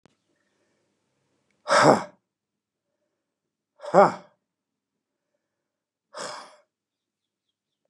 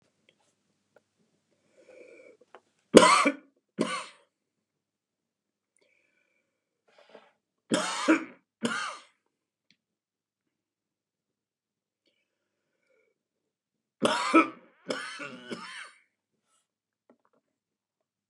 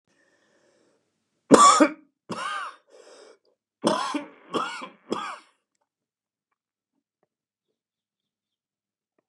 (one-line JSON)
{"exhalation_length": "7.9 s", "exhalation_amplitude": 29458, "exhalation_signal_mean_std_ratio": 0.2, "three_cough_length": "18.3 s", "three_cough_amplitude": 32768, "three_cough_signal_mean_std_ratio": 0.22, "cough_length": "9.3 s", "cough_amplitude": 32767, "cough_signal_mean_std_ratio": 0.25, "survey_phase": "beta (2021-08-13 to 2022-03-07)", "age": "65+", "gender": "Male", "wearing_mask": "No", "symptom_new_continuous_cough": true, "symptom_fever_high_temperature": true, "symptom_onset": "7 days", "smoker_status": "Ex-smoker", "respiratory_condition_asthma": false, "respiratory_condition_other": false, "recruitment_source": "REACT", "submission_delay": "1 day", "covid_test_result": "Negative", "covid_test_method": "RT-qPCR", "influenza_a_test_result": "Negative", "influenza_b_test_result": "Negative"}